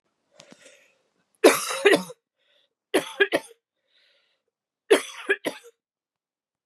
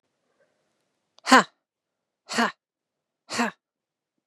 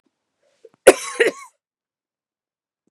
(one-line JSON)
{"three_cough_length": "6.7 s", "three_cough_amplitude": 29016, "three_cough_signal_mean_std_ratio": 0.27, "exhalation_length": "4.3 s", "exhalation_amplitude": 32726, "exhalation_signal_mean_std_ratio": 0.21, "cough_length": "2.9 s", "cough_amplitude": 32768, "cough_signal_mean_std_ratio": 0.19, "survey_phase": "beta (2021-08-13 to 2022-03-07)", "age": "18-44", "gender": "Female", "wearing_mask": "No", "symptom_cough_any": true, "symptom_runny_or_blocked_nose": true, "symptom_sore_throat": true, "symptom_fatigue": true, "symptom_headache": true, "symptom_onset": "4 days", "smoker_status": "Never smoked", "respiratory_condition_asthma": true, "respiratory_condition_other": false, "recruitment_source": "Test and Trace", "submission_delay": "2 days", "covid_test_result": "Positive", "covid_test_method": "RT-qPCR", "covid_ct_value": 19.5, "covid_ct_gene": "ORF1ab gene", "covid_ct_mean": 19.7, "covid_viral_load": "350000 copies/ml", "covid_viral_load_category": "Low viral load (10K-1M copies/ml)"}